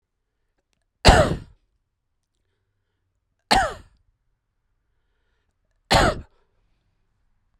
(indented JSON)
{
  "three_cough_length": "7.6 s",
  "three_cough_amplitude": 32768,
  "three_cough_signal_mean_std_ratio": 0.24,
  "survey_phase": "beta (2021-08-13 to 2022-03-07)",
  "age": "45-64",
  "gender": "Male",
  "wearing_mask": "No",
  "symptom_none": true,
  "smoker_status": "Never smoked",
  "respiratory_condition_asthma": false,
  "respiratory_condition_other": false,
  "recruitment_source": "REACT",
  "submission_delay": "1 day",
  "covid_test_result": "Negative",
  "covid_test_method": "RT-qPCR"
}